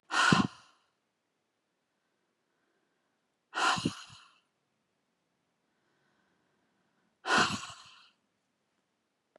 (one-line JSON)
{"exhalation_length": "9.4 s", "exhalation_amplitude": 12623, "exhalation_signal_mean_std_ratio": 0.26, "survey_phase": "beta (2021-08-13 to 2022-03-07)", "age": "18-44", "gender": "Female", "wearing_mask": "No", "symptom_none": true, "smoker_status": "Never smoked", "respiratory_condition_asthma": false, "respiratory_condition_other": false, "recruitment_source": "REACT", "submission_delay": "1 day", "covid_test_result": "Negative", "covid_test_method": "RT-qPCR", "influenza_a_test_result": "Negative", "influenza_b_test_result": "Negative"}